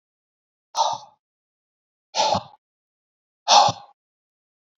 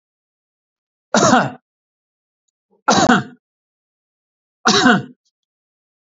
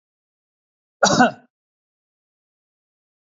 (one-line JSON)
{"exhalation_length": "4.8 s", "exhalation_amplitude": 25032, "exhalation_signal_mean_std_ratio": 0.29, "three_cough_length": "6.1 s", "three_cough_amplitude": 32380, "three_cough_signal_mean_std_ratio": 0.33, "cough_length": "3.3 s", "cough_amplitude": 27677, "cough_signal_mean_std_ratio": 0.22, "survey_phase": "beta (2021-08-13 to 2022-03-07)", "age": "45-64", "gender": "Male", "wearing_mask": "No", "symptom_none": true, "smoker_status": "Never smoked", "respiratory_condition_asthma": false, "respiratory_condition_other": false, "recruitment_source": "REACT", "submission_delay": "1 day", "covid_test_result": "Negative", "covid_test_method": "RT-qPCR", "influenza_a_test_result": "Unknown/Void", "influenza_b_test_result": "Unknown/Void"}